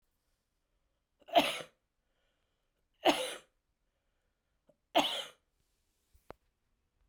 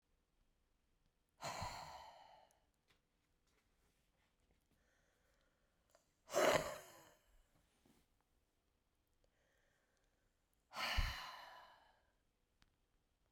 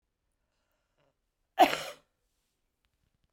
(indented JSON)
{
  "three_cough_length": "7.1 s",
  "three_cough_amplitude": 8804,
  "three_cough_signal_mean_std_ratio": 0.23,
  "exhalation_length": "13.3 s",
  "exhalation_amplitude": 3141,
  "exhalation_signal_mean_std_ratio": 0.25,
  "cough_length": "3.3 s",
  "cough_amplitude": 12532,
  "cough_signal_mean_std_ratio": 0.17,
  "survey_phase": "beta (2021-08-13 to 2022-03-07)",
  "age": "45-64",
  "gender": "Female",
  "wearing_mask": "No",
  "symptom_none": true,
  "smoker_status": "Ex-smoker",
  "respiratory_condition_asthma": true,
  "respiratory_condition_other": false,
  "recruitment_source": "REACT",
  "submission_delay": "2 days",
  "covid_test_result": "Negative",
  "covid_test_method": "RT-qPCR"
}